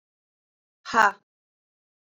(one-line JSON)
{"exhalation_length": "2.0 s", "exhalation_amplitude": 20253, "exhalation_signal_mean_std_ratio": 0.21, "survey_phase": "beta (2021-08-13 to 2022-03-07)", "age": "45-64", "gender": "Female", "wearing_mask": "No", "symptom_none": true, "smoker_status": "Current smoker (1 to 10 cigarettes per day)", "respiratory_condition_asthma": false, "respiratory_condition_other": false, "recruitment_source": "REACT", "submission_delay": "7 days", "covid_test_result": "Negative", "covid_test_method": "RT-qPCR"}